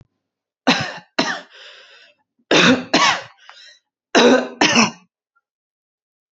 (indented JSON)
{
  "three_cough_length": "6.3 s",
  "three_cough_amplitude": 31628,
  "three_cough_signal_mean_std_ratio": 0.4,
  "survey_phase": "beta (2021-08-13 to 2022-03-07)",
  "age": "18-44",
  "gender": "Female",
  "wearing_mask": "No",
  "symptom_none": true,
  "smoker_status": "Never smoked",
  "respiratory_condition_asthma": false,
  "respiratory_condition_other": false,
  "recruitment_source": "REACT",
  "submission_delay": "1 day",
  "covid_test_result": "Negative",
  "covid_test_method": "RT-qPCR",
  "influenza_a_test_result": "Negative",
  "influenza_b_test_result": "Negative"
}